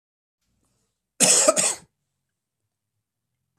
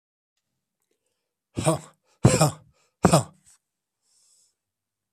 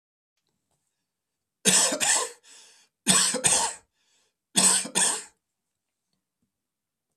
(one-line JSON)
{"cough_length": "3.6 s", "cough_amplitude": 24569, "cough_signal_mean_std_ratio": 0.29, "exhalation_length": "5.1 s", "exhalation_amplitude": 23633, "exhalation_signal_mean_std_ratio": 0.25, "three_cough_length": "7.2 s", "three_cough_amplitude": 21019, "three_cough_signal_mean_std_ratio": 0.39, "survey_phase": "beta (2021-08-13 to 2022-03-07)", "age": "65+", "gender": "Male", "wearing_mask": "No", "symptom_cough_any": true, "symptom_runny_or_blocked_nose": true, "symptom_abdominal_pain": true, "symptom_diarrhoea": true, "symptom_fatigue": true, "symptom_headache": true, "symptom_onset": "5 days", "smoker_status": "Never smoked", "respiratory_condition_asthma": false, "respiratory_condition_other": false, "recruitment_source": "Test and Trace", "submission_delay": "2 days", "covid_test_result": "Positive", "covid_test_method": "RT-qPCR", "covid_ct_value": 18.3, "covid_ct_gene": "ORF1ab gene", "covid_ct_mean": 19.6, "covid_viral_load": "370000 copies/ml", "covid_viral_load_category": "Low viral load (10K-1M copies/ml)"}